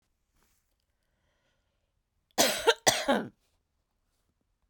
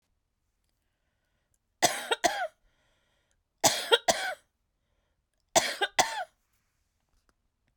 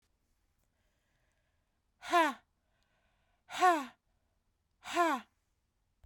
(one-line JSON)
{"cough_length": "4.7 s", "cough_amplitude": 15816, "cough_signal_mean_std_ratio": 0.27, "three_cough_length": "7.8 s", "three_cough_amplitude": 20026, "three_cough_signal_mean_std_ratio": 0.29, "exhalation_length": "6.1 s", "exhalation_amplitude": 5279, "exhalation_signal_mean_std_ratio": 0.28, "survey_phase": "beta (2021-08-13 to 2022-03-07)", "age": "45-64", "gender": "Female", "wearing_mask": "No", "symptom_cough_any": true, "symptom_runny_or_blocked_nose": true, "symptom_abdominal_pain": true, "symptom_fatigue": true, "symptom_onset": "12 days", "smoker_status": "Never smoked", "respiratory_condition_asthma": false, "respiratory_condition_other": false, "recruitment_source": "REACT", "submission_delay": "1 day", "covid_test_result": "Negative", "covid_test_method": "RT-qPCR", "influenza_a_test_result": "Negative", "influenza_b_test_result": "Negative"}